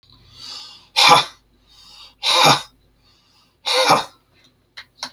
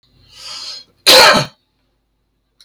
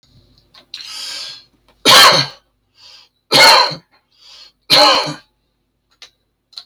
{"exhalation_length": "5.1 s", "exhalation_amplitude": 32767, "exhalation_signal_mean_std_ratio": 0.38, "cough_length": "2.6 s", "cough_amplitude": 32768, "cough_signal_mean_std_ratio": 0.35, "three_cough_length": "6.7 s", "three_cough_amplitude": 32768, "three_cough_signal_mean_std_ratio": 0.38, "survey_phase": "beta (2021-08-13 to 2022-03-07)", "age": "45-64", "gender": "Male", "wearing_mask": "No", "symptom_none": true, "smoker_status": "Never smoked", "respiratory_condition_asthma": false, "respiratory_condition_other": false, "recruitment_source": "REACT", "submission_delay": "1 day", "covid_test_result": "Negative", "covid_test_method": "RT-qPCR"}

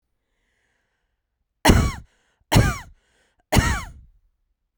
{"three_cough_length": "4.8 s", "three_cough_amplitude": 32768, "three_cough_signal_mean_std_ratio": 0.31, "survey_phase": "beta (2021-08-13 to 2022-03-07)", "age": "18-44", "gender": "Female", "wearing_mask": "No", "symptom_none": true, "smoker_status": "Never smoked", "respiratory_condition_asthma": false, "respiratory_condition_other": false, "recruitment_source": "REACT", "submission_delay": "2 days", "covid_test_result": "Negative", "covid_test_method": "RT-qPCR"}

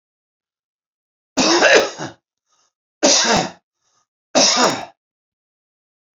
{"three_cough_length": "6.1 s", "three_cough_amplitude": 32149, "three_cough_signal_mean_std_ratio": 0.4, "survey_phase": "beta (2021-08-13 to 2022-03-07)", "age": "45-64", "gender": "Male", "wearing_mask": "No", "symptom_none": true, "smoker_status": "Ex-smoker", "respiratory_condition_asthma": false, "respiratory_condition_other": false, "recruitment_source": "REACT", "submission_delay": "1 day", "covid_test_result": "Negative", "covid_test_method": "RT-qPCR"}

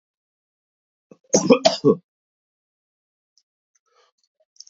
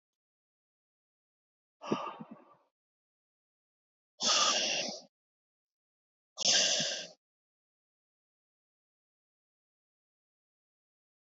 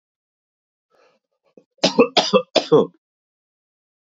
{"cough_length": "4.7 s", "cough_amplitude": 29764, "cough_signal_mean_std_ratio": 0.22, "exhalation_length": "11.3 s", "exhalation_amplitude": 6540, "exhalation_signal_mean_std_ratio": 0.29, "three_cough_length": "4.0 s", "three_cough_amplitude": 27585, "three_cough_signal_mean_std_ratio": 0.29, "survey_phase": "beta (2021-08-13 to 2022-03-07)", "age": "18-44", "gender": "Male", "wearing_mask": "No", "symptom_cough_any": true, "symptom_runny_or_blocked_nose": true, "symptom_onset": "4 days", "smoker_status": "Never smoked", "respiratory_condition_asthma": false, "respiratory_condition_other": false, "recruitment_source": "Test and Trace", "submission_delay": "2 days", "covid_test_result": "Positive", "covid_test_method": "RT-qPCR", "covid_ct_value": 30.7, "covid_ct_gene": "N gene"}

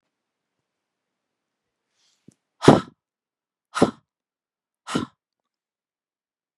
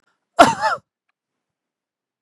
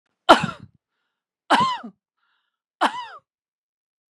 {"exhalation_length": "6.6 s", "exhalation_amplitude": 32768, "exhalation_signal_mean_std_ratio": 0.15, "cough_length": "2.2 s", "cough_amplitude": 32768, "cough_signal_mean_std_ratio": 0.25, "three_cough_length": "4.1 s", "three_cough_amplitude": 32768, "three_cough_signal_mean_std_ratio": 0.26, "survey_phase": "beta (2021-08-13 to 2022-03-07)", "age": "45-64", "gender": "Female", "wearing_mask": "No", "symptom_none": true, "smoker_status": "Never smoked", "respiratory_condition_asthma": true, "respiratory_condition_other": false, "recruitment_source": "REACT", "submission_delay": "2 days", "covid_test_result": "Negative", "covid_test_method": "RT-qPCR", "influenza_a_test_result": "Negative", "influenza_b_test_result": "Negative"}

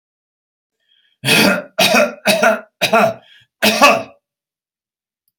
{"cough_length": "5.4 s", "cough_amplitude": 32768, "cough_signal_mean_std_ratio": 0.47, "survey_phase": "alpha (2021-03-01 to 2021-08-12)", "age": "65+", "gender": "Male", "wearing_mask": "No", "symptom_none": true, "smoker_status": "Ex-smoker", "respiratory_condition_asthma": false, "respiratory_condition_other": false, "recruitment_source": "REACT", "submission_delay": "1 day", "covid_test_result": "Negative", "covid_test_method": "RT-qPCR"}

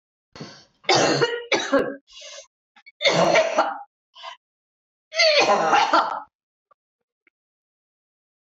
{"three_cough_length": "8.5 s", "three_cough_amplitude": 17729, "three_cough_signal_mean_std_ratio": 0.47, "survey_phase": "beta (2021-08-13 to 2022-03-07)", "age": "45-64", "gender": "Female", "wearing_mask": "No", "symptom_cough_any": true, "symptom_runny_or_blocked_nose": true, "symptom_sore_throat": true, "symptom_headache": true, "symptom_change_to_sense_of_smell_or_taste": true, "symptom_loss_of_taste": true, "symptom_onset": "5 days", "smoker_status": "Never smoked", "respiratory_condition_asthma": true, "respiratory_condition_other": false, "recruitment_source": "Test and Trace", "submission_delay": "2 days", "covid_test_result": "Positive", "covid_test_method": "RT-qPCR", "covid_ct_value": 16.3, "covid_ct_gene": "ORF1ab gene", "covid_ct_mean": 16.8, "covid_viral_load": "3100000 copies/ml", "covid_viral_load_category": "High viral load (>1M copies/ml)"}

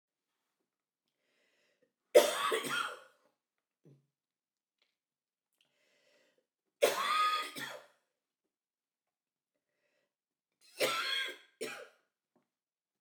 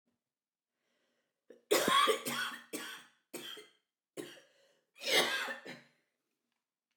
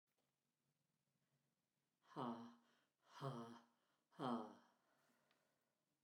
{"three_cough_length": "13.0 s", "three_cough_amplitude": 10795, "three_cough_signal_mean_std_ratio": 0.28, "cough_length": "7.0 s", "cough_amplitude": 5348, "cough_signal_mean_std_ratio": 0.37, "exhalation_length": "6.0 s", "exhalation_amplitude": 723, "exhalation_signal_mean_std_ratio": 0.34, "survey_phase": "beta (2021-08-13 to 2022-03-07)", "age": "45-64", "gender": "Female", "wearing_mask": "No", "symptom_runny_or_blocked_nose": true, "symptom_sore_throat": true, "symptom_fatigue": true, "symptom_headache": true, "symptom_other": true, "smoker_status": "Never smoked", "respiratory_condition_asthma": false, "respiratory_condition_other": false, "recruitment_source": "Test and Trace", "submission_delay": "2 days", "covid_test_result": "Positive", "covid_test_method": "RT-qPCR", "covid_ct_value": 33.5, "covid_ct_gene": "ORF1ab gene"}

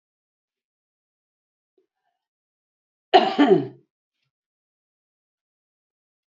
{"cough_length": "6.3 s", "cough_amplitude": 27853, "cough_signal_mean_std_ratio": 0.2, "survey_phase": "beta (2021-08-13 to 2022-03-07)", "age": "65+", "gender": "Female", "wearing_mask": "No", "symptom_headache": true, "smoker_status": "Ex-smoker", "respiratory_condition_asthma": false, "respiratory_condition_other": false, "recruitment_source": "REACT", "submission_delay": "2 days", "covid_test_result": "Negative", "covid_test_method": "RT-qPCR", "influenza_a_test_result": "Negative", "influenza_b_test_result": "Negative"}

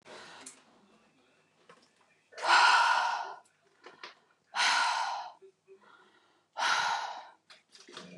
{"exhalation_length": "8.2 s", "exhalation_amplitude": 8787, "exhalation_signal_mean_std_ratio": 0.43, "survey_phase": "beta (2021-08-13 to 2022-03-07)", "age": "18-44", "gender": "Female", "wearing_mask": "Yes", "symptom_none": true, "smoker_status": "Ex-smoker", "respiratory_condition_asthma": false, "respiratory_condition_other": false, "recruitment_source": "REACT", "submission_delay": "0 days", "covid_test_result": "Negative", "covid_test_method": "RT-qPCR", "influenza_a_test_result": "Negative", "influenza_b_test_result": "Negative"}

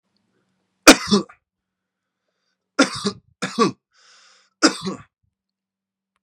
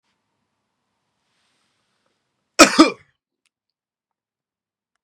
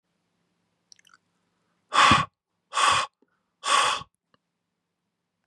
{"three_cough_length": "6.2 s", "three_cough_amplitude": 32768, "three_cough_signal_mean_std_ratio": 0.24, "cough_length": "5.0 s", "cough_amplitude": 32768, "cough_signal_mean_std_ratio": 0.16, "exhalation_length": "5.5 s", "exhalation_amplitude": 19018, "exhalation_signal_mean_std_ratio": 0.33, "survey_phase": "beta (2021-08-13 to 2022-03-07)", "age": "18-44", "gender": "Male", "wearing_mask": "No", "symptom_none": true, "smoker_status": "Never smoked", "respiratory_condition_asthma": true, "respiratory_condition_other": false, "recruitment_source": "REACT", "submission_delay": "3 days", "covid_test_result": "Negative", "covid_test_method": "RT-qPCR", "influenza_a_test_result": "Negative", "influenza_b_test_result": "Negative"}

